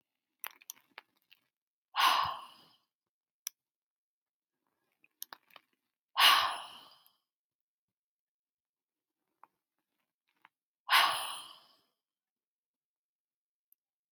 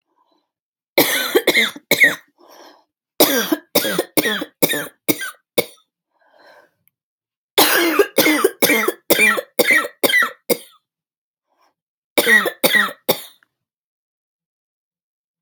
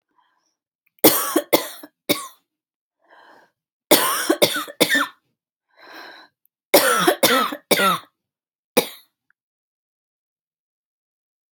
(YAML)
exhalation_length: 14.1 s
exhalation_amplitude: 8877
exhalation_signal_mean_std_ratio: 0.22
cough_length: 15.4 s
cough_amplitude: 32768
cough_signal_mean_std_ratio: 0.44
three_cough_length: 11.5 s
three_cough_amplitude: 32768
three_cough_signal_mean_std_ratio: 0.35
survey_phase: alpha (2021-03-01 to 2021-08-12)
age: 45-64
gender: Female
wearing_mask: 'No'
symptom_none: true
smoker_status: Ex-smoker
respiratory_condition_asthma: false
respiratory_condition_other: false
recruitment_source: REACT
submission_delay: 1 day
covid_test_result: Negative
covid_test_method: RT-qPCR